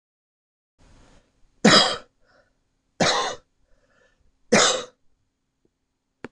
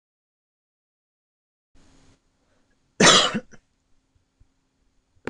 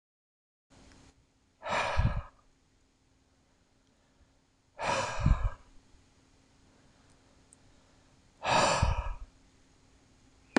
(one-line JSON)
{"three_cough_length": "6.3 s", "three_cough_amplitude": 26027, "three_cough_signal_mean_std_ratio": 0.29, "cough_length": "5.3 s", "cough_amplitude": 25898, "cough_signal_mean_std_ratio": 0.2, "exhalation_length": "10.6 s", "exhalation_amplitude": 11989, "exhalation_signal_mean_std_ratio": 0.35, "survey_phase": "beta (2021-08-13 to 2022-03-07)", "age": "18-44", "gender": "Male", "wearing_mask": "No", "symptom_none": true, "smoker_status": "Never smoked", "respiratory_condition_asthma": false, "respiratory_condition_other": false, "recruitment_source": "Test and Trace", "submission_delay": "1 day", "covid_test_result": "Negative", "covid_test_method": "LFT"}